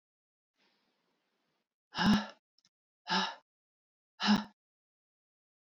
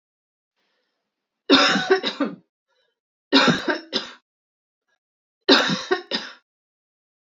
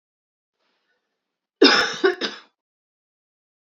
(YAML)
exhalation_length: 5.7 s
exhalation_amplitude: 5277
exhalation_signal_mean_std_ratio: 0.28
three_cough_length: 7.3 s
three_cough_amplitude: 28606
three_cough_signal_mean_std_ratio: 0.36
cough_length: 3.8 s
cough_amplitude: 26499
cough_signal_mean_std_ratio: 0.27
survey_phase: alpha (2021-03-01 to 2021-08-12)
age: 45-64
gender: Female
wearing_mask: 'No'
symptom_cough_any: true
symptom_fatigue: true
symptom_onset: 3 days
smoker_status: Ex-smoker
respiratory_condition_asthma: false
respiratory_condition_other: false
recruitment_source: Test and Trace
submission_delay: 1 day
covid_test_result: Positive
covid_test_method: RT-qPCR
covid_ct_value: 19.5
covid_ct_gene: ORF1ab gene
covid_ct_mean: 19.9
covid_viral_load: 300000 copies/ml
covid_viral_load_category: Low viral load (10K-1M copies/ml)